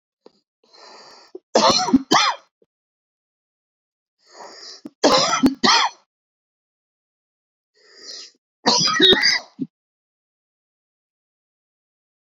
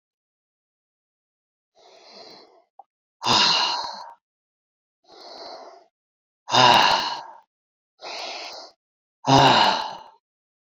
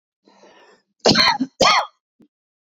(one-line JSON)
{"three_cough_length": "12.2 s", "three_cough_amplitude": 28749, "three_cough_signal_mean_std_ratio": 0.34, "exhalation_length": "10.7 s", "exhalation_amplitude": 25841, "exhalation_signal_mean_std_ratio": 0.36, "cough_length": "2.7 s", "cough_amplitude": 27481, "cough_signal_mean_std_ratio": 0.39, "survey_phase": "beta (2021-08-13 to 2022-03-07)", "age": "65+", "gender": "Male", "wearing_mask": "No", "symptom_none": true, "smoker_status": "Ex-smoker", "respiratory_condition_asthma": false, "respiratory_condition_other": false, "recruitment_source": "REACT", "submission_delay": "2 days", "covid_test_result": "Negative", "covid_test_method": "RT-qPCR", "influenza_a_test_result": "Negative", "influenza_b_test_result": "Negative"}